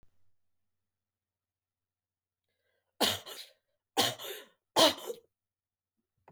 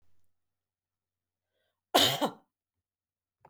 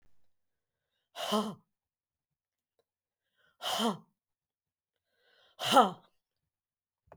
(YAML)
three_cough_length: 6.3 s
three_cough_amplitude: 9782
three_cough_signal_mean_std_ratio: 0.24
cough_length: 3.5 s
cough_amplitude: 11711
cough_signal_mean_std_ratio: 0.23
exhalation_length: 7.2 s
exhalation_amplitude: 10943
exhalation_signal_mean_std_ratio: 0.24
survey_phase: beta (2021-08-13 to 2022-03-07)
age: 45-64
gender: Female
wearing_mask: 'No'
symptom_none: true
smoker_status: Never smoked
respiratory_condition_asthma: false
respiratory_condition_other: false
recruitment_source: REACT
submission_delay: 1 day
covid_test_result: Negative
covid_test_method: RT-qPCR
influenza_a_test_result: Negative
influenza_b_test_result: Negative